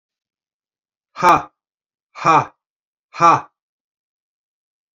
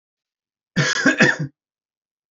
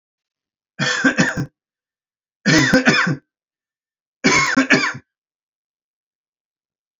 {
  "exhalation_length": "4.9 s",
  "exhalation_amplitude": 28966,
  "exhalation_signal_mean_std_ratio": 0.27,
  "cough_length": "2.3 s",
  "cough_amplitude": 26985,
  "cough_signal_mean_std_ratio": 0.4,
  "three_cough_length": "7.0 s",
  "three_cough_amplitude": 29008,
  "three_cough_signal_mean_std_ratio": 0.42,
  "survey_phase": "beta (2021-08-13 to 2022-03-07)",
  "age": "45-64",
  "gender": "Male",
  "wearing_mask": "No",
  "symptom_none": true,
  "symptom_onset": "12 days",
  "smoker_status": "Never smoked",
  "respiratory_condition_asthma": false,
  "respiratory_condition_other": false,
  "recruitment_source": "REACT",
  "submission_delay": "1 day",
  "covid_test_result": "Negative",
  "covid_test_method": "RT-qPCR",
  "influenza_a_test_result": "Negative",
  "influenza_b_test_result": "Negative"
}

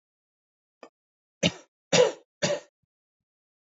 {
  "three_cough_length": "3.8 s",
  "three_cough_amplitude": 13992,
  "three_cough_signal_mean_std_ratio": 0.26,
  "survey_phase": "beta (2021-08-13 to 2022-03-07)",
  "age": "18-44",
  "gender": "Male",
  "wearing_mask": "No",
  "symptom_cough_any": true,
  "symptom_runny_or_blocked_nose": true,
  "symptom_shortness_of_breath": true,
  "symptom_sore_throat": true,
  "symptom_fatigue": true,
  "smoker_status": "Ex-smoker",
  "respiratory_condition_asthma": false,
  "respiratory_condition_other": false,
  "recruitment_source": "Test and Trace",
  "submission_delay": "2 days",
  "covid_test_result": "Positive",
  "covid_test_method": "RT-qPCR",
  "covid_ct_value": 23.4,
  "covid_ct_gene": "ORF1ab gene"
}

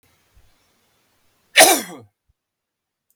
{
  "cough_length": "3.2 s",
  "cough_amplitude": 32768,
  "cough_signal_mean_std_ratio": 0.22,
  "survey_phase": "beta (2021-08-13 to 2022-03-07)",
  "age": "45-64",
  "gender": "Male",
  "wearing_mask": "No",
  "symptom_cough_any": true,
  "symptom_onset": "5 days",
  "smoker_status": "Never smoked",
  "respiratory_condition_asthma": false,
  "respiratory_condition_other": false,
  "recruitment_source": "Test and Trace",
  "submission_delay": "2 days",
  "covid_test_result": "Positive",
  "covid_test_method": "ePCR"
}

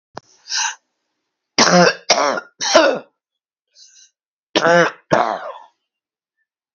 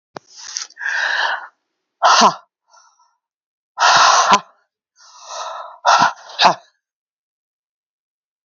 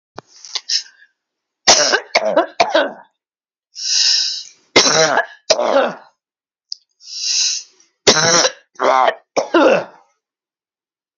{
  "cough_length": "6.7 s",
  "cough_amplitude": 31403,
  "cough_signal_mean_std_ratio": 0.4,
  "exhalation_length": "8.4 s",
  "exhalation_amplitude": 32768,
  "exhalation_signal_mean_std_ratio": 0.4,
  "three_cough_length": "11.2 s",
  "three_cough_amplitude": 32768,
  "three_cough_signal_mean_std_ratio": 0.49,
  "survey_phase": "beta (2021-08-13 to 2022-03-07)",
  "age": "45-64",
  "gender": "Female",
  "wearing_mask": "No",
  "symptom_none": true,
  "smoker_status": "Ex-smoker",
  "respiratory_condition_asthma": false,
  "respiratory_condition_other": false,
  "recruitment_source": "REACT",
  "submission_delay": "3 days",
  "covid_test_result": "Negative",
  "covid_test_method": "RT-qPCR",
  "influenza_a_test_result": "Negative",
  "influenza_b_test_result": "Negative"
}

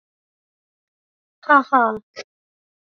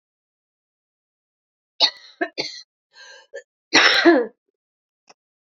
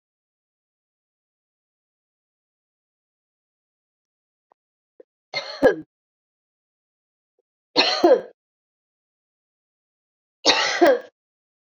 {
  "exhalation_length": "3.0 s",
  "exhalation_amplitude": 27844,
  "exhalation_signal_mean_std_ratio": 0.24,
  "cough_length": "5.5 s",
  "cough_amplitude": 32229,
  "cough_signal_mean_std_ratio": 0.29,
  "three_cough_length": "11.8 s",
  "three_cough_amplitude": 29774,
  "three_cough_signal_mean_std_ratio": 0.23,
  "survey_phase": "beta (2021-08-13 to 2022-03-07)",
  "age": "45-64",
  "gender": "Female",
  "wearing_mask": "No",
  "symptom_cough_any": true,
  "symptom_runny_or_blocked_nose": true,
  "symptom_shortness_of_breath": true,
  "symptom_sore_throat": true,
  "symptom_fatigue": true,
  "symptom_change_to_sense_of_smell_or_taste": true,
  "symptom_onset": "8 days",
  "smoker_status": "Never smoked",
  "respiratory_condition_asthma": false,
  "respiratory_condition_other": false,
  "recruitment_source": "Test and Trace",
  "submission_delay": "2 days",
  "covid_test_result": "Positive",
  "covid_test_method": "RT-qPCR",
  "covid_ct_value": 20.6,
  "covid_ct_gene": "ORF1ab gene",
  "covid_ct_mean": 21.1,
  "covid_viral_load": "120000 copies/ml",
  "covid_viral_load_category": "Low viral load (10K-1M copies/ml)"
}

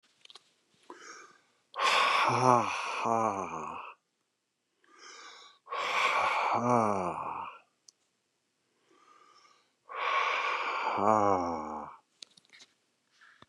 {
  "exhalation_length": "13.5 s",
  "exhalation_amplitude": 12344,
  "exhalation_signal_mean_std_ratio": 0.5,
  "survey_phase": "beta (2021-08-13 to 2022-03-07)",
  "age": "65+",
  "gender": "Male",
  "wearing_mask": "No",
  "symptom_none": true,
  "symptom_onset": "6 days",
  "smoker_status": "Ex-smoker",
  "respiratory_condition_asthma": false,
  "respiratory_condition_other": false,
  "recruitment_source": "REACT",
  "submission_delay": "5 days",
  "covid_test_result": "Negative",
  "covid_test_method": "RT-qPCR",
  "influenza_a_test_result": "Negative",
  "influenza_b_test_result": "Negative"
}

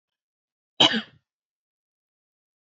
{
  "cough_length": "2.6 s",
  "cough_amplitude": 24560,
  "cough_signal_mean_std_ratio": 0.19,
  "survey_phase": "alpha (2021-03-01 to 2021-08-12)",
  "age": "18-44",
  "gender": "Female",
  "wearing_mask": "No",
  "symptom_fatigue": true,
  "smoker_status": "Never smoked",
  "respiratory_condition_asthma": false,
  "respiratory_condition_other": false,
  "recruitment_source": "REACT",
  "submission_delay": "1 day",
  "covid_test_result": "Negative",
  "covid_test_method": "RT-qPCR"
}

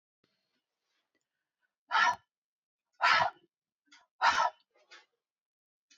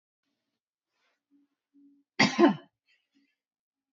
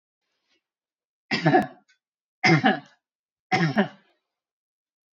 {
  "exhalation_length": "6.0 s",
  "exhalation_amplitude": 7028,
  "exhalation_signal_mean_std_ratio": 0.29,
  "cough_length": "3.9 s",
  "cough_amplitude": 14130,
  "cough_signal_mean_std_ratio": 0.21,
  "three_cough_length": "5.1 s",
  "three_cough_amplitude": 21092,
  "three_cough_signal_mean_std_ratio": 0.33,
  "survey_phase": "beta (2021-08-13 to 2022-03-07)",
  "age": "45-64",
  "gender": "Female",
  "wearing_mask": "No",
  "symptom_none": true,
  "symptom_onset": "3 days",
  "smoker_status": "Never smoked",
  "respiratory_condition_asthma": false,
  "respiratory_condition_other": false,
  "recruitment_source": "REACT",
  "submission_delay": "2 days",
  "covid_test_result": "Negative",
  "covid_test_method": "RT-qPCR",
  "influenza_a_test_result": "Negative",
  "influenza_b_test_result": "Negative"
}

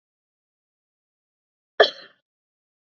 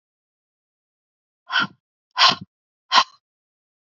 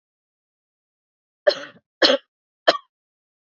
{
  "cough_length": "3.0 s",
  "cough_amplitude": 28151,
  "cough_signal_mean_std_ratio": 0.12,
  "exhalation_length": "3.9 s",
  "exhalation_amplitude": 28849,
  "exhalation_signal_mean_std_ratio": 0.25,
  "three_cough_length": "3.5 s",
  "three_cough_amplitude": 30849,
  "three_cough_signal_mean_std_ratio": 0.22,
  "survey_phase": "beta (2021-08-13 to 2022-03-07)",
  "age": "45-64",
  "gender": "Female",
  "wearing_mask": "No",
  "symptom_cough_any": true,
  "symptom_runny_or_blocked_nose": true,
  "symptom_sore_throat": true,
  "smoker_status": "Never smoked",
  "respiratory_condition_asthma": false,
  "respiratory_condition_other": false,
  "recruitment_source": "Test and Trace",
  "submission_delay": "2 days",
  "covid_test_result": "Positive",
  "covid_test_method": "RT-qPCR",
  "covid_ct_value": 18.4,
  "covid_ct_gene": "ORF1ab gene"
}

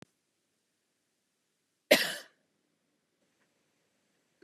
{
  "cough_length": "4.4 s",
  "cough_amplitude": 15257,
  "cough_signal_mean_std_ratio": 0.15,
  "survey_phase": "beta (2021-08-13 to 2022-03-07)",
  "age": "18-44",
  "gender": "Female",
  "wearing_mask": "No",
  "symptom_cough_any": true,
  "symptom_sore_throat": true,
  "symptom_fatigue": true,
  "symptom_other": true,
  "symptom_onset": "3 days",
  "smoker_status": "Never smoked",
  "respiratory_condition_asthma": false,
  "respiratory_condition_other": false,
  "recruitment_source": "REACT",
  "submission_delay": "1 day",
  "covid_test_result": "Negative",
  "covid_test_method": "RT-qPCR",
  "influenza_a_test_result": "Negative",
  "influenza_b_test_result": "Negative"
}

